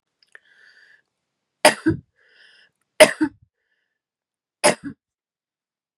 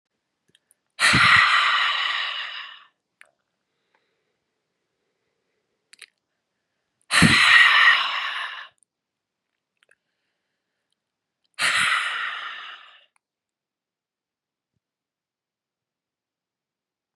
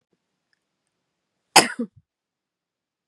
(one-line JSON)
{"three_cough_length": "6.0 s", "three_cough_amplitude": 32768, "three_cough_signal_mean_std_ratio": 0.2, "exhalation_length": "17.2 s", "exhalation_amplitude": 24595, "exhalation_signal_mean_std_ratio": 0.35, "cough_length": "3.1 s", "cough_amplitude": 32768, "cough_signal_mean_std_ratio": 0.15, "survey_phase": "beta (2021-08-13 to 2022-03-07)", "age": "45-64", "gender": "Female", "wearing_mask": "No", "symptom_change_to_sense_of_smell_or_taste": true, "smoker_status": "Ex-smoker", "respiratory_condition_asthma": false, "respiratory_condition_other": false, "recruitment_source": "REACT", "submission_delay": "1 day", "covid_test_result": "Negative", "covid_test_method": "RT-qPCR", "influenza_a_test_result": "Unknown/Void", "influenza_b_test_result": "Unknown/Void"}